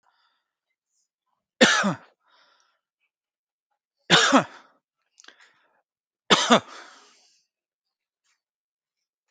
{"three_cough_length": "9.3 s", "three_cough_amplitude": 27870, "three_cough_signal_mean_std_ratio": 0.24, "survey_phase": "beta (2021-08-13 to 2022-03-07)", "age": "45-64", "gender": "Male", "wearing_mask": "No", "symptom_none": true, "smoker_status": "Never smoked", "respiratory_condition_asthma": false, "respiratory_condition_other": false, "recruitment_source": "REACT", "submission_delay": "2 days", "covid_test_result": "Negative", "covid_test_method": "RT-qPCR"}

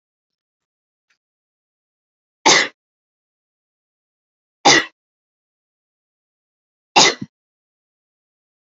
{"three_cough_length": "8.8 s", "three_cough_amplitude": 32263, "three_cough_signal_mean_std_ratio": 0.2, "survey_phase": "beta (2021-08-13 to 2022-03-07)", "age": "18-44", "gender": "Female", "wearing_mask": "No", "symptom_none": true, "smoker_status": "Never smoked", "respiratory_condition_asthma": false, "respiratory_condition_other": false, "recruitment_source": "REACT", "submission_delay": "0 days", "covid_test_result": "Negative", "covid_test_method": "RT-qPCR", "influenza_a_test_result": "Negative", "influenza_b_test_result": "Negative"}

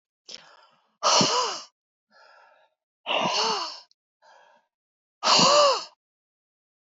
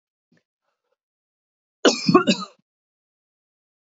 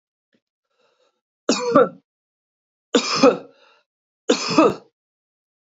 {"exhalation_length": "6.8 s", "exhalation_amplitude": 16388, "exhalation_signal_mean_std_ratio": 0.41, "cough_length": "3.9 s", "cough_amplitude": 27067, "cough_signal_mean_std_ratio": 0.23, "three_cough_length": "5.7 s", "three_cough_amplitude": 26891, "three_cough_signal_mean_std_ratio": 0.33, "survey_phase": "beta (2021-08-13 to 2022-03-07)", "age": "45-64", "gender": "Female", "wearing_mask": "No", "symptom_none": true, "smoker_status": "Ex-smoker", "respiratory_condition_asthma": false, "respiratory_condition_other": false, "recruitment_source": "REACT", "submission_delay": "1 day", "covid_test_result": "Negative", "covid_test_method": "RT-qPCR", "influenza_a_test_result": "Negative", "influenza_b_test_result": "Negative"}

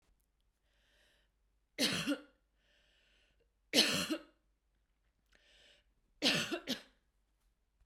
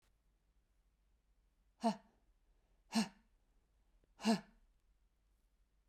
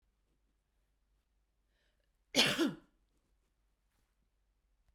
{"three_cough_length": "7.9 s", "three_cough_amplitude": 6861, "three_cough_signal_mean_std_ratio": 0.31, "exhalation_length": "5.9 s", "exhalation_amplitude": 2435, "exhalation_signal_mean_std_ratio": 0.23, "cough_length": "4.9 s", "cough_amplitude": 5719, "cough_signal_mean_std_ratio": 0.22, "survey_phase": "beta (2021-08-13 to 2022-03-07)", "age": "18-44", "gender": "Female", "wearing_mask": "No", "symptom_sore_throat": true, "symptom_fatigue": true, "symptom_headache": true, "symptom_onset": "1 day", "smoker_status": "Never smoked", "respiratory_condition_asthma": false, "respiratory_condition_other": false, "recruitment_source": "Test and Trace", "submission_delay": "1 day", "covid_test_result": "Negative", "covid_test_method": "RT-qPCR"}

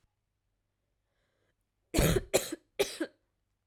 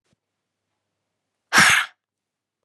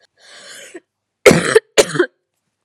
{"three_cough_length": "3.7 s", "three_cough_amplitude": 8821, "three_cough_signal_mean_std_ratio": 0.3, "exhalation_length": "2.6 s", "exhalation_amplitude": 28050, "exhalation_signal_mean_std_ratio": 0.27, "cough_length": "2.6 s", "cough_amplitude": 32768, "cough_signal_mean_std_ratio": 0.32, "survey_phase": "alpha (2021-03-01 to 2021-08-12)", "age": "18-44", "gender": "Female", "wearing_mask": "No", "symptom_none": true, "symptom_onset": "9 days", "smoker_status": "Never smoked", "respiratory_condition_asthma": false, "respiratory_condition_other": false, "recruitment_source": "REACT", "submission_delay": "1 day", "covid_test_result": "Negative", "covid_test_method": "RT-qPCR"}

